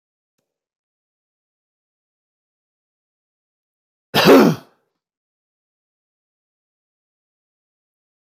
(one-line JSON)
{"cough_length": "8.4 s", "cough_amplitude": 28736, "cough_signal_mean_std_ratio": 0.17, "survey_phase": "beta (2021-08-13 to 2022-03-07)", "age": "65+", "gender": "Male", "wearing_mask": "No", "symptom_none": true, "symptom_onset": "13 days", "smoker_status": "Never smoked", "respiratory_condition_asthma": false, "respiratory_condition_other": false, "recruitment_source": "REACT", "submission_delay": "1 day", "covid_test_result": "Negative", "covid_test_method": "RT-qPCR", "influenza_a_test_result": "Unknown/Void", "influenza_b_test_result": "Unknown/Void"}